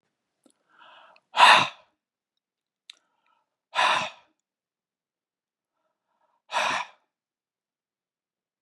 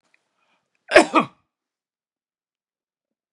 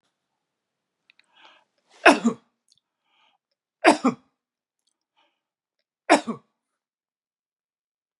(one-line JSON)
{"exhalation_length": "8.6 s", "exhalation_amplitude": 25417, "exhalation_signal_mean_std_ratio": 0.23, "cough_length": "3.3 s", "cough_amplitude": 32768, "cough_signal_mean_std_ratio": 0.18, "three_cough_length": "8.2 s", "three_cough_amplitude": 32697, "three_cough_signal_mean_std_ratio": 0.19, "survey_phase": "beta (2021-08-13 to 2022-03-07)", "age": "65+", "gender": "Male", "wearing_mask": "No", "symptom_none": true, "smoker_status": "Ex-smoker", "respiratory_condition_asthma": false, "respiratory_condition_other": false, "recruitment_source": "REACT", "submission_delay": "2 days", "covid_test_result": "Negative", "covid_test_method": "RT-qPCR"}